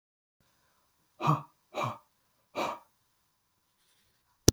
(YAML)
exhalation_length: 4.5 s
exhalation_amplitude: 32133
exhalation_signal_mean_std_ratio: 0.22
survey_phase: beta (2021-08-13 to 2022-03-07)
age: 45-64
gender: Male
wearing_mask: 'No'
symptom_none: true
symptom_onset: 4 days
smoker_status: Never smoked
respiratory_condition_asthma: false
respiratory_condition_other: false
recruitment_source: REACT
submission_delay: 1 day
covid_test_result: Negative
covid_test_method: RT-qPCR
influenza_a_test_result: Negative
influenza_b_test_result: Negative